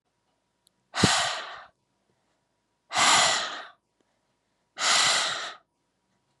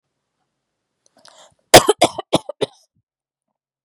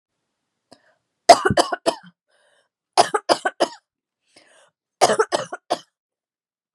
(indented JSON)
{
  "exhalation_length": "6.4 s",
  "exhalation_amplitude": 16555,
  "exhalation_signal_mean_std_ratio": 0.42,
  "cough_length": "3.8 s",
  "cough_amplitude": 32768,
  "cough_signal_mean_std_ratio": 0.2,
  "three_cough_length": "6.7 s",
  "three_cough_amplitude": 32768,
  "three_cough_signal_mean_std_ratio": 0.27,
  "survey_phase": "beta (2021-08-13 to 2022-03-07)",
  "age": "18-44",
  "gender": "Female",
  "wearing_mask": "No",
  "symptom_cough_any": true,
  "symptom_new_continuous_cough": true,
  "symptom_runny_or_blocked_nose": true,
  "symptom_sore_throat": true,
  "symptom_fatigue": true,
  "symptom_fever_high_temperature": true,
  "symptom_headache": true,
  "symptom_onset": "6 days",
  "smoker_status": "Never smoked",
  "respiratory_condition_asthma": false,
  "respiratory_condition_other": false,
  "recruitment_source": "Test and Trace",
  "submission_delay": "1 day",
  "covid_test_result": "Positive",
  "covid_test_method": "RT-qPCR",
  "covid_ct_value": 31.2,
  "covid_ct_gene": "ORF1ab gene"
}